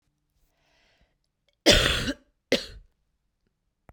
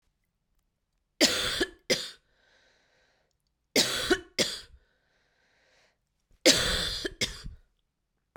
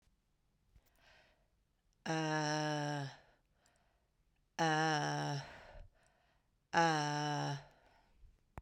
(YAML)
cough_length: 3.9 s
cough_amplitude: 23743
cough_signal_mean_std_ratio: 0.27
three_cough_length: 8.4 s
three_cough_amplitude: 18071
three_cough_signal_mean_std_ratio: 0.35
exhalation_length: 8.6 s
exhalation_amplitude: 5642
exhalation_signal_mean_std_ratio: 0.49
survey_phase: beta (2021-08-13 to 2022-03-07)
age: 45-64
gender: Female
wearing_mask: 'No'
symptom_new_continuous_cough: true
symptom_sore_throat: true
symptom_fever_high_temperature: true
symptom_headache: true
symptom_change_to_sense_of_smell_or_taste: true
symptom_onset: 3 days
smoker_status: Ex-smoker
respiratory_condition_asthma: false
respiratory_condition_other: false
recruitment_source: Test and Trace
submission_delay: 1 day
covid_test_result: Positive
covid_test_method: RT-qPCR